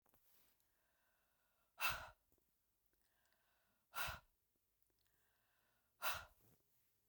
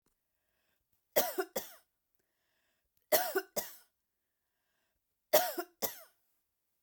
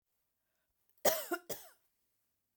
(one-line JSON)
{"exhalation_length": "7.1 s", "exhalation_amplitude": 1380, "exhalation_signal_mean_std_ratio": 0.26, "three_cough_length": "6.8 s", "three_cough_amplitude": 10487, "three_cough_signal_mean_std_ratio": 0.27, "cough_length": "2.6 s", "cough_amplitude": 6255, "cough_signal_mean_std_ratio": 0.26, "survey_phase": "beta (2021-08-13 to 2022-03-07)", "age": "45-64", "gender": "Female", "wearing_mask": "No", "symptom_none": true, "smoker_status": "Never smoked", "respiratory_condition_asthma": false, "respiratory_condition_other": false, "recruitment_source": "REACT", "submission_delay": "1 day", "covid_test_result": "Negative", "covid_test_method": "RT-qPCR"}